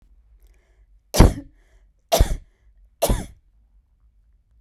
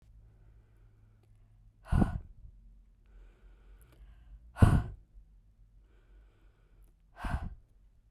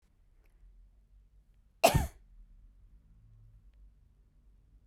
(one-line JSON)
{"three_cough_length": "4.6 s", "three_cough_amplitude": 32768, "three_cough_signal_mean_std_ratio": 0.26, "exhalation_length": "8.1 s", "exhalation_amplitude": 12844, "exhalation_signal_mean_std_ratio": 0.26, "cough_length": "4.9 s", "cough_amplitude": 11460, "cough_signal_mean_std_ratio": 0.21, "survey_phase": "beta (2021-08-13 to 2022-03-07)", "age": "18-44", "gender": "Female", "wearing_mask": "No", "symptom_none": true, "smoker_status": "Ex-smoker", "respiratory_condition_asthma": false, "respiratory_condition_other": false, "recruitment_source": "REACT", "submission_delay": "1 day", "covid_test_result": "Negative", "covid_test_method": "RT-qPCR", "influenza_a_test_result": "Unknown/Void", "influenza_b_test_result": "Unknown/Void"}